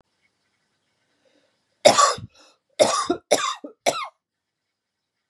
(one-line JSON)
{"three_cough_length": "5.3 s", "three_cough_amplitude": 31528, "three_cough_signal_mean_std_ratio": 0.31, "survey_phase": "beta (2021-08-13 to 2022-03-07)", "age": "18-44", "gender": "Female", "wearing_mask": "No", "symptom_none": true, "smoker_status": "Never smoked", "respiratory_condition_asthma": false, "respiratory_condition_other": false, "recruitment_source": "REACT", "submission_delay": "1 day", "covid_test_result": "Negative", "covid_test_method": "RT-qPCR", "influenza_a_test_result": "Negative", "influenza_b_test_result": "Negative"}